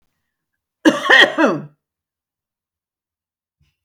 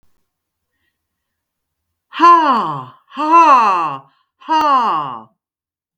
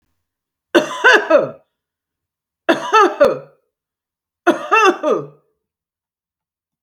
cough_length: 3.8 s
cough_amplitude: 32768
cough_signal_mean_std_ratio: 0.3
exhalation_length: 6.0 s
exhalation_amplitude: 32768
exhalation_signal_mean_std_ratio: 0.48
three_cough_length: 6.8 s
three_cough_amplitude: 32768
three_cough_signal_mean_std_ratio: 0.38
survey_phase: beta (2021-08-13 to 2022-03-07)
age: 65+
gender: Female
wearing_mask: 'No'
symptom_none: true
smoker_status: Ex-smoker
respiratory_condition_asthma: false
respiratory_condition_other: true
recruitment_source: REACT
submission_delay: 3 days
covid_test_result: Negative
covid_test_method: RT-qPCR
influenza_a_test_result: Negative
influenza_b_test_result: Negative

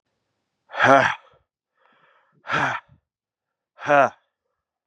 exhalation_length: 4.9 s
exhalation_amplitude: 32403
exhalation_signal_mean_std_ratio: 0.31
survey_phase: beta (2021-08-13 to 2022-03-07)
age: 18-44
gender: Male
wearing_mask: 'No'
symptom_cough_any: true
symptom_new_continuous_cough: true
symptom_runny_or_blocked_nose: true
symptom_shortness_of_breath: true
symptom_sore_throat: true
symptom_fatigue: true
symptom_headache: true
symptom_change_to_sense_of_smell_or_taste: true
symptom_onset: 3 days
smoker_status: Ex-smoker
respiratory_condition_asthma: false
respiratory_condition_other: false
recruitment_source: Test and Trace
submission_delay: 1 day
covid_test_result: Positive
covid_test_method: ePCR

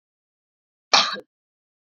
cough_length: 1.9 s
cough_amplitude: 27141
cough_signal_mean_std_ratio: 0.23
survey_phase: beta (2021-08-13 to 2022-03-07)
age: 18-44
gender: Female
wearing_mask: 'No'
symptom_cough_any: true
symptom_runny_or_blocked_nose: true
symptom_sore_throat: true
symptom_headache: true
symptom_change_to_sense_of_smell_or_taste: true
smoker_status: Never smoked
respiratory_condition_asthma: false
respiratory_condition_other: false
recruitment_source: Test and Trace
submission_delay: 2 days
covid_test_result: Positive
covid_test_method: RT-qPCR
covid_ct_value: 19.1
covid_ct_gene: ORF1ab gene
covid_ct_mean: 20.2
covid_viral_load: 230000 copies/ml
covid_viral_load_category: Low viral load (10K-1M copies/ml)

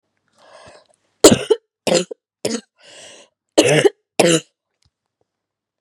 cough_length: 5.8 s
cough_amplitude: 32768
cough_signal_mean_std_ratio: 0.31
survey_phase: beta (2021-08-13 to 2022-03-07)
age: 18-44
gender: Female
wearing_mask: 'No'
symptom_cough_any: true
symptom_fatigue: true
symptom_headache: true
symptom_other: true
symptom_onset: 4 days
smoker_status: Ex-smoker
respiratory_condition_asthma: false
respiratory_condition_other: false
recruitment_source: Test and Trace
submission_delay: 1 day
covid_test_result: Positive
covid_test_method: ePCR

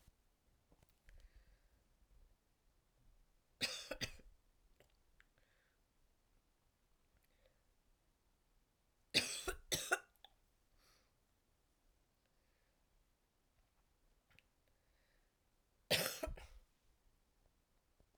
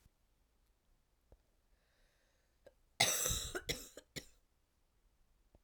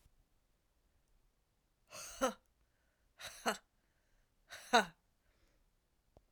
three_cough_length: 18.2 s
three_cough_amplitude: 3936
three_cough_signal_mean_std_ratio: 0.24
cough_length: 5.6 s
cough_amplitude: 7275
cough_signal_mean_std_ratio: 0.28
exhalation_length: 6.3 s
exhalation_amplitude: 4872
exhalation_signal_mean_std_ratio: 0.21
survey_phase: alpha (2021-03-01 to 2021-08-12)
age: 18-44
gender: Female
wearing_mask: 'No'
symptom_cough_any: true
symptom_fatigue: true
symptom_fever_high_temperature: true
symptom_headache: true
symptom_change_to_sense_of_smell_or_taste: true
symptom_loss_of_taste: true
symptom_onset: 3 days
smoker_status: Ex-smoker
respiratory_condition_asthma: false
respiratory_condition_other: false
recruitment_source: Test and Trace
submission_delay: 1 day
covid_test_result: Positive
covid_test_method: RT-qPCR
covid_ct_value: 27.6
covid_ct_gene: ORF1ab gene
covid_ct_mean: 27.9
covid_viral_load: 690 copies/ml
covid_viral_load_category: Minimal viral load (< 10K copies/ml)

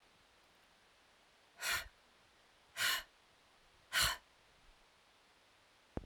exhalation_length: 6.1 s
exhalation_amplitude: 3162
exhalation_signal_mean_std_ratio: 0.32
survey_phase: beta (2021-08-13 to 2022-03-07)
age: 45-64
gender: Female
wearing_mask: 'No'
symptom_cough_any: true
symptom_runny_or_blocked_nose: true
symptom_sore_throat: true
symptom_onset: 12 days
smoker_status: Never smoked
respiratory_condition_asthma: false
respiratory_condition_other: false
recruitment_source: REACT
submission_delay: 2 days
covid_test_result: Negative
covid_test_method: RT-qPCR
influenza_a_test_result: Negative
influenza_b_test_result: Negative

